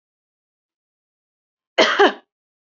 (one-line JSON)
{"cough_length": "2.6 s", "cough_amplitude": 27657, "cough_signal_mean_std_ratio": 0.26, "survey_phase": "beta (2021-08-13 to 2022-03-07)", "age": "18-44", "gender": "Female", "wearing_mask": "No", "symptom_none": true, "smoker_status": "Never smoked", "respiratory_condition_asthma": false, "respiratory_condition_other": false, "recruitment_source": "REACT", "submission_delay": "1 day", "covid_test_result": "Negative", "covid_test_method": "RT-qPCR"}